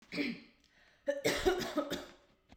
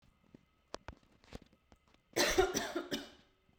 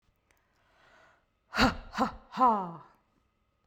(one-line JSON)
{"cough_length": "2.6 s", "cough_amplitude": 4133, "cough_signal_mean_std_ratio": 0.54, "three_cough_length": "3.6 s", "three_cough_amplitude": 5526, "three_cough_signal_mean_std_ratio": 0.36, "exhalation_length": "3.7 s", "exhalation_amplitude": 10754, "exhalation_signal_mean_std_ratio": 0.34, "survey_phase": "beta (2021-08-13 to 2022-03-07)", "age": "18-44", "gender": "Female", "wearing_mask": "No", "symptom_runny_or_blocked_nose": true, "symptom_sore_throat": true, "smoker_status": "Never smoked", "respiratory_condition_asthma": false, "respiratory_condition_other": false, "recruitment_source": "REACT", "submission_delay": "2 days", "covid_test_result": "Negative", "covid_test_method": "RT-qPCR", "influenza_a_test_result": "Negative", "influenza_b_test_result": "Negative"}